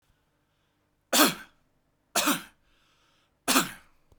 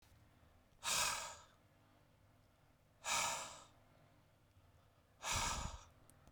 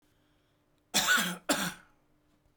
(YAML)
three_cough_length: 4.2 s
three_cough_amplitude: 17204
three_cough_signal_mean_std_ratio: 0.31
exhalation_length: 6.3 s
exhalation_amplitude: 1853
exhalation_signal_mean_std_ratio: 0.44
cough_length: 2.6 s
cough_amplitude: 8599
cough_signal_mean_std_ratio: 0.41
survey_phase: beta (2021-08-13 to 2022-03-07)
age: 18-44
gender: Male
wearing_mask: 'No'
symptom_none: true
smoker_status: Ex-smoker
respiratory_condition_asthma: false
respiratory_condition_other: false
recruitment_source: REACT
submission_delay: 2 days
covid_test_result: Negative
covid_test_method: RT-qPCR
influenza_a_test_result: Negative
influenza_b_test_result: Negative